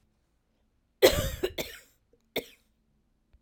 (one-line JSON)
{"cough_length": "3.4 s", "cough_amplitude": 19993, "cough_signal_mean_std_ratio": 0.26, "survey_phase": "beta (2021-08-13 to 2022-03-07)", "age": "45-64", "gender": "Female", "wearing_mask": "No", "symptom_cough_any": true, "symptom_runny_or_blocked_nose": true, "symptom_sore_throat": true, "symptom_fatigue": true, "symptom_headache": true, "smoker_status": "Never smoked", "respiratory_condition_asthma": false, "respiratory_condition_other": false, "recruitment_source": "Test and Trace", "submission_delay": "1 day", "covid_test_result": "Positive", "covid_test_method": "LFT"}